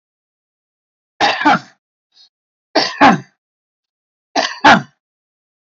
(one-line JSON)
{"three_cough_length": "5.7 s", "three_cough_amplitude": 28965, "three_cough_signal_mean_std_ratio": 0.33, "survey_phase": "alpha (2021-03-01 to 2021-08-12)", "age": "45-64", "gender": "Male", "wearing_mask": "No", "symptom_none": true, "smoker_status": "Current smoker (11 or more cigarettes per day)", "respiratory_condition_asthma": false, "respiratory_condition_other": false, "recruitment_source": "REACT", "submission_delay": "1 day", "covid_test_result": "Negative", "covid_test_method": "RT-qPCR"}